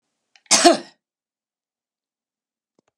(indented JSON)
{
  "cough_length": "3.0 s",
  "cough_amplitude": 32767,
  "cough_signal_mean_std_ratio": 0.22,
  "survey_phase": "beta (2021-08-13 to 2022-03-07)",
  "age": "65+",
  "gender": "Female",
  "wearing_mask": "No",
  "symptom_none": true,
  "smoker_status": "Never smoked",
  "respiratory_condition_asthma": false,
  "respiratory_condition_other": false,
  "recruitment_source": "REACT",
  "submission_delay": "1 day",
  "covid_test_result": "Negative",
  "covid_test_method": "RT-qPCR",
  "influenza_a_test_result": "Negative",
  "influenza_b_test_result": "Negative"
}